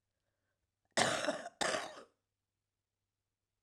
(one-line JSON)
{"cough_length": "3.6 s", "cough_amplitude": 7447, "cough_signal_mean_std_ratio": 0.34, "survey_phase": "alpha (2021-03-01 to 2021-08-12)", "age": "45-64", "gender": "Female", "wearing_mask": "No", "symptom_cough_any": true, "symptom_fatigue": true, "symptom_change_to_sense_of_smell_or_taste": true, "smoker_status": "Never smoked", "respiratory_condition_asthma": true, "respiratory_condition_other": false, "recruitment_source": "Test and Trace", "submission_delay": "1 day", "covid_test_result": "Positive", "covid_test_method": "RT-qPCR"}